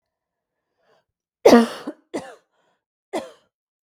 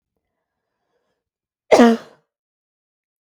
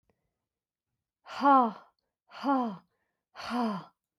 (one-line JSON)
{"three_cough_length": "3.9 s", "three_cough_amplitude": 32768, "three_cough_signal_mean_std_ratio": 0.22, "cough_length": "3.2 s", "cough_amplitude": 32768, "cough_signal_mean_std_ratio": 0.22, "exhalation_length": "4.2 s", "exhalation_amplitude": 8636, "exhalation_signal_mean_std_ratio": 0.38, "survey_phase": "beta (2021-08-13 to 2022-03-07)", "age": "45-64", "gender": "Female", "wearing_mask": "No", "symptom_sore_throat": true, "smoker_status": "Ex-smoker", "respiratory_condition_asthma": false, "respiratory_condition_other": false, "recruitment_source": "REACT", "submission_delay": "2 days", "covid_test_result": "Negative", "covid_test_method": "RT-qPCR", "influenza_a_test_result": "Unknown/Void", "influenza_b_test_result": "Unknown/Void"}